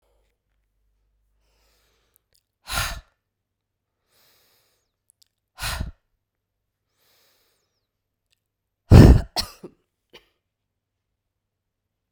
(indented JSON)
{
  "exhalation_length": "12.1 s",
  "exhalation_amplitude": 32768,
  "exhalation_signal_mean_std_ratio": 0.15,
  "survey_phase": "beta (2021-08-13 to 2022-03-07)",
  "age": "45-64",
  "gender": "Female",
  "wearing_mask": "No",
  "symptom_new_continuous_cough": true,
  "symptom_runny_or_blocked_nose": true,
  "symptom_shortness_of_breath": true,
  "symptom_sore_throat": true,
  "symptom_fatigue": true,
  "symptom_change_to_sense_of_smell_or_taste": true,
  "symptom_loss_of_taste": true,
  "symptom_onset": "4 days",
  "smoker_status": "Never smoked",
  "respiratory_condition_asthma": false,
  "respiratory_condition_other": false,
  "recruitment_source": "Test and Trace",
  "submission_delay": "2 days",
  "covid_test_result": "Positive",
  "covid_test_method": "RT-qPCR",
  "covid_ct_value": 20.3,
  "covid_ct_gene": "ORF1ab gene"
}